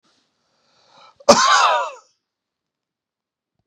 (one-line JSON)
{"cough_length": "3.7 s", "cough_amplitude": 32768, "cough_signal_mean_std_ratio": 0.31, "survey_phase": "beta (2021-08-13 to 2022-03-07)", "age": "65+", "gender": "Male", "wearing_mask": "No", "symptom_none": true, "smoker_status": "Ex-smoker", "respiratory_condition_asthma": false, "respiratory_condition_other": false, "recruitment_source": "REACT", "submission_delay": "1 day", "covid_test_result": "Negative", "covid_test_method": "RT-qPCR"}